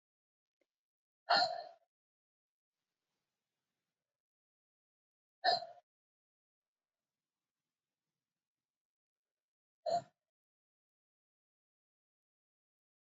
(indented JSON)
{
  "exhalation_length": "13.1 s",
  "exhalation_amplitude": 4184,
  "exhalation_signal_mean_std_ratio": 0.17,
  "survey_phase": "beta (2021-08-13 to 2022-03-07)",
  "age": "18-44",
  "gender": "Female",
  "wearing_mask": "No",
  "symptom_cough_any": true,
  "symptom_runny_or_blocked_nose": true,
  "symptom_shortness_of_breath": true,
  "symptom_sore_throat": true,
  "symptom_fatigue": true,
  "symptom_change_to_sense_of_smell_or_taste": true,
  "symptom_loss_of_taste": true,
  "smoker_status": "Ex-smoker",
  "respiratory_condition_asthma": false,
  "respiratory_condition_other": false,
  "recruitment_source": "Test and Trace",
  "submission_delay": "4 days",
  "covid_test_result": "Positive",
  "covid_test_method": "RT-qPCR",
  "covid_ct_value": 27.8,
  "covid_ct_gene": "ORF1ab gene",
  "covid_ct_mean": 28.5,
  "covid_viral_load": "450 copies/ml",
  "covid_viral_load_category": "Minimal viral load (< 10K copies/ml)"
}